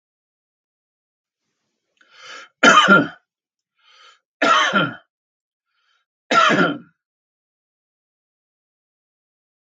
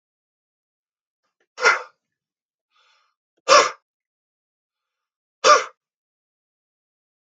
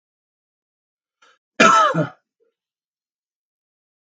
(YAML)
three_cough_length: 9.7 s
three_cough_amplitude: 32768
three_cough_signal_mean_std_ratio: 0.29
exhalation_length: 7.3 s
exhalation_amplitude: 32768
exhalation_signal_mean_std_ratio: 0.21
cough_length: 4.1 s
cough_amplitude: 32768
cough_signal_mean_std_ratio: 0.26
survey_phase: beta (2021-08-13 to 2022-03-07)
age: 65+
gender: Male
wearing_mask: 'No'
symptom_none: true
smoker_status: Never smoked
respiratory_condition_asthma: false
respiratory_condition_other: false
recruitment_source: REACT
submission_delay: 1 day
covid_test_result: Negative
covid_test_method: RT-qPCR
influenza_a_test_result: Negative
influenza_b_test_result: Negative